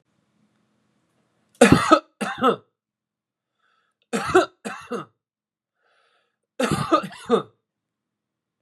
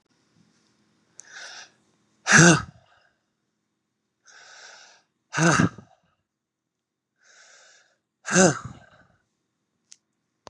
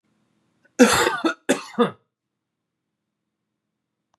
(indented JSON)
{
  "three_cough_length": "8.6 s",
  "three_cough_amplitude": 32761,
  "three_cough_signal_mean_std_ratio": 0.29,
  "exhalation_length": "10.5 s",
  "exhalation_amplitude": 27934,
  "exhalation_signal_mean_std_ratio": 0.24,
  "cough_length": "4.2 s",
  "cough_amplitude": 32007,
  "cough_signal_mean_std_ratio": 0.3,
  "survey_phase": "beta (2021-08-13 to 2022-03-07)",
  "age": "18-44",
  "gender": "Male",
  "wearing_mask": "No",
  "symptom_none": true,
  "smoker_status": "Never smoked",
  "respiratory_condition_asthma": true,
  "respiratory_condition_other": false,
  "recruitment_source": "REACT",
  "submission_delay": "2 days",
  "covid_test_result": "Negative",
  "covid_test_method": "RT-qPCR",
  "influenza_a_test_result": "Negative",
  "influenza_b_test_result": "Negative"
}